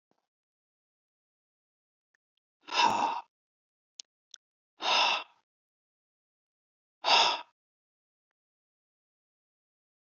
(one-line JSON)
{"exhalation_length": "10.2 s", "exhalation_amplitude": 9618, "exhalation_signal_mean_std_ratio": 0.26, "survey_phase": "alpha (2021-03-01 to 2021-08-12)", "age": "65+", "gender": "Male", "wearing_mask": "No", "symptom_none": true, "smoker_status": "Never smoked", "respiratory_condition_asthma": false, "respiratory_condition_other": false, "recruitment_source": "REACT", "submission_delay": "1 day", "covid_test_result": "Negative", "covid_test_method": "RT-qPCR"}